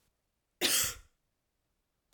{"cough_length": "2.1 s", "cough_amplitude": 5571, "cough_signal_mean_std_ratio": 0.31, "survey_phase": "alpha (2021-03-01 to 2021-08-12)", "age": "45-64", "gender": "Female", "wearing_mask": "No", "symptom_none": true, "smoker_status": "Ex-smoker", "respiratory_condition_asthma": false, "respiratory_condition_other": false, "recruitment_source": "REACT", "submission_delay": "2 days", "covid_test_result": "Negative", "covid_test_method": "RT-qPCR"}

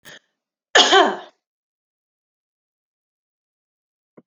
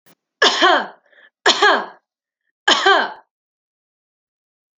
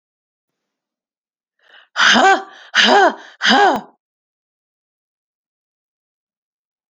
{"cough_length": "4.3 s", "cough_amplitude": 30139, "cough_signal_mean_std_ratio": 0.23, "three_cough_length": "4.8 s", "three_cough_amplitude": 28842, "three_cough_signal_mean_std_ratio": 0.39, "exhalation_length": "6.9 s", "exhalation_amplitude": 30751, "exhalation_signal_mean_std_ratio": 0.34, "survey_phase": "alpha (2021-03-01 to 2021-08-12)", "age": "18-44", "gender": "Female", "wearing_mask": "No", "symptom_none": true, "smoker_status": "Never smoked", "respiratory_condition_asthma": false, "respiratory_condition_other": false, "recruitment_source": "REACT", "submission_delay": "2 days", "covid_test_result": "Negative", "covid_test_method": "RT-qPCR"}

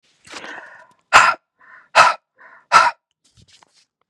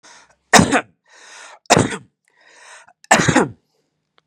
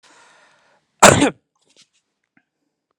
{"exhalation_length": "4.1 s", "exhalation_amplitude": 32768, "exhalation_signal_mean_std_ratio": 0.31, "three_cough_length": "4.3 s", "three_cough_amplitude": 32768, "three_cough_signal_mean_std_ratio": 0.33, "cough_length": "3.0 s", "cough_amplitude": 32768, "cough_signal_mean_std_ratio": 0.22, "survey_phase": "beta (2021-08-13 to 2022-03-07)", "age": "45-64", "gender": "Male", "wearing_mask": "No", "symptom_none": true, "symptom_onset": "12 days", "smoker_status": "Current smoker (11 or more cigarettes per day)", "respiratory_condition_asthma": false, "respiratory_condition_other": false, "recruitment_source": "REACT", "submission_delay": "1 day", "covid_test_result": "Negative", "covid_test_method": "RT-qPCR", "influenza_a_test_result": "Negative", "influenza_b_test_result": "Negative"}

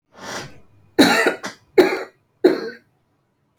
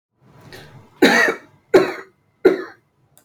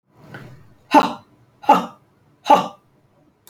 {"three_cough_length": "3.6 s", "three_cough_amplitude": 30417, "three_cough_signal_mean_std_ratio": 0.38, "cough_length": "3.2 s", "cough_amplitude": 29300, "cough_signal_mean_std_ratio": 0.36, "exhalation_length": "3.5 s", "exhalation_amplitude": 28006, "exhalation_signal_mean_std_ratio": 0.3, "survey_phase": "alpha (2021-03-01 to 2021-08-12)", "age": "45-64", "gender": "Female", "wearing_mask": "No", "symptom_none": true, "smoker_status": "Never smoked", "respiratory_condition_asthma": false, "respiratory_condition_other": false, "recruitment_source": "REACT", "submission_delay": "2 days", "covid_test_result": "Negative", "covid_test_method": "RT-qPCR"}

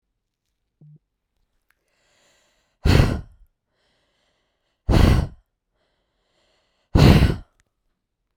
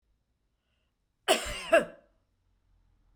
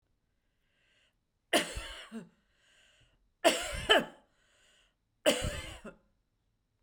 {"exhalation_length": "8.4 s", "exhalation_amplitude": 32768, "exhalation_signal_mean_std_ratio": 0.28, "cough_length": "3.2 s", "cough_amplitude": 12449, "cough_signal_mean_std_ratio": 0.26, "three_cough_length": "6.8 s", "three_cough_amplitude": 11622, "three_cough_signal_mean_std_ratio": 0.3, "survey_phase": "beta (2021-08-13 to 2022-03-07)", "age": "45-64", "gender": "Female", "wearing_mask": "No", "symptom_none": true, "smoker_status": "Never smoked", "respiratory_condition_asthma": false, "respiratory_condition_other": false, "recruitment_source": "REACT", "submission_delay": "0 days", "covid_test_result": "Negative", "covid_test_method": "RT-qPCR", "influenza_a_test_result": "Negative", "influenza_b_test_result": "Negative"}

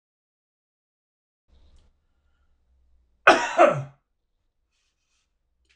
{"cough_length": "5.8 s", "cough_amplitude": 25858, "cough_signal_mean_std_ratio": 0.2, "survey_phase": "beta (2021-08-13 to 2022-03-07)", "age": "45-64", "gender": "Male", "wearing_mask": "No", "symptom_none": true, "smoker_status": "Ex-smoker", "respiratory_condition_asthma": false, "respiratory_condition_other": true, "recruitment_source": "REACT", "submission_delay": "2 days", "covid_test_result": "Negative", "covid_test_method": "RT-qPCR", "influenza_a_test_result": "Negative", "influenza_b_test_result": "Negative"}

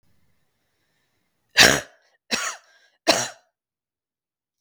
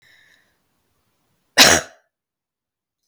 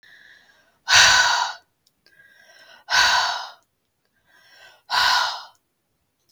{"three_cough_length": "4.6 s", "three_cough_amplitude": 32768, "three_cough_signal_mean_std_ratio": 0.24, "cough_length": "3.1 s", "cough_amplitude": 32768, "cough_signal_mean_std_ratio": 0.21, "exhalation_length": "6.3 s", "exhalation_amplitude": 32521, "exhalation_signal_mean_std_ratio": 0.41, "survey_phase": "beta (2021-08-13 to 2022-03-07)", "age": "45-64", "gender": "Female", "wearing_mask": "No", "symptom_cough_any": true, "symptom_runny_or_blocked_nose": true, "symptom_sore_throat": true, "symptom_fatigue": true, "symptom_onset": "7 days", "smoker_status": "Ex-smoker", "respiratory_condition_asthma": false, "respiratory_condition_other": false, "recruitment_source": "Test and Trace", "submission_delay": "2 days", "covid_test_result": "Positive", "covid_test_method": "ePCR"}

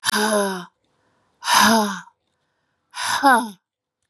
{"exhalation_length": "4.1 s", "exhalation_amplitude": 29225, "exhalation_signal_mean_std_ratio": 0.48, "survey_phase": "beta (2021-08-13 to 2022-03-07)", "age": "45-64", "gender": "Female", "wearing_mask": "No", "symptom_cough_any": true, "symptom_runny_or_blocked_nose": true, "symptom_sore_throat": true, "symptom_fatigue": true, "symptom_onset": "3 days", "smoker_status": "Never smoked", "recruitment_source": "Test and Trace", "submission_delay": "1 day", "covid_test_result": "Positive", "covid_test_method": "RT-qPCR", "covid_ct_value": 23.3, "covid_ct_gene": "N gene"}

